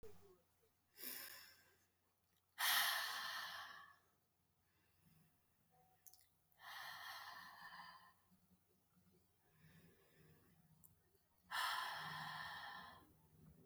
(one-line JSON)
{"exhalation_length": "13.7 s", "exhalation_amplitude": 1769, "exhalation_signal_mean_std_ratio": 0.42, "survey_phase": "alpha (2021-03-01 to 2021-08-12)", "age": "18-44", "gender": "Female", "wearing_mask": "No", "symptom_none": true, "symptom_onset": "13 days", "smoker_status": "Never smoked", "respiratory_condition_asthma": false, "respiratory_condition_other": false, "recruitment_source": "REACT", "submission_delay": "6 days", "covid_test_result": "Negative", "covid_test_method": "RT-qPCR"}